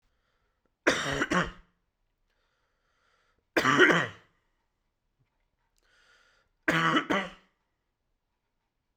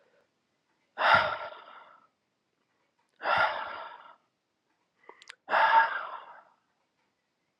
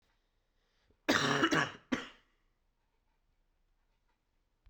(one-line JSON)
{"three_cough_length": "9.0 s", "three_cough_amplitude": 15004, "three_cough_signal_mean_std_ratio": 0.31, "exhalation_length": "7.6 s", "exhalation_amplitude": 10771, "exhalation_signal_mean_std_ratio": 0.35, "cough_length": "4.7 s", "cough_amplitude": 6911, "cough_signal_mean_std_ratio": 0.31, "survey_phase": "alpha (2021-03-01 to 2021-08-12)", "age": "18-44", "gender": "Male", "wearing_mask": "No", "symptom_cough_any": true, "symptom_new_continuous_cough": true, "symptom_fever_high_temperature": true, "symptom_headache": true, "symptom_onset": "4 days", "smoker_status": "Never smoked", "respiratory_condition_asthma": false, "respiratory_condition_other": false, "recruitment_source": "Test and Trace", "submission_delay": "2 days", "covid_test_result": "Positive", "covid_test_method": "RT-qPCR"}